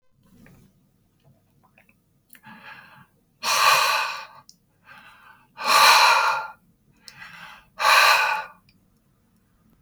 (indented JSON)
{
  "exhalation_length": "9.8 s",
  "exhalation_amplitude": 26955,
  "exhalation_signal_mean_std_ratio": 0.39,
  "survey_phase": "beta (2021-08-13 to 2022-03-07)",
  "age": "65+",
  "gender": "Male",
  "wearing_mask": "No",
  "symptom_none": true,
  "smoker_status": "Current smoker (1 to 10 cigarettes per day)",
  "respiratory_condition_asthma": false,
  "respiratory_condition_other": false,
  "recruitment_source": "REACT",
  "submission_delay": "2 days",
  "covid_test_result": "Negative",
  "covid_test_method": "RT-qPCR",
  "influenza_a_test_result": "Negative",
  "influenza_b_test_result": "Negative"
}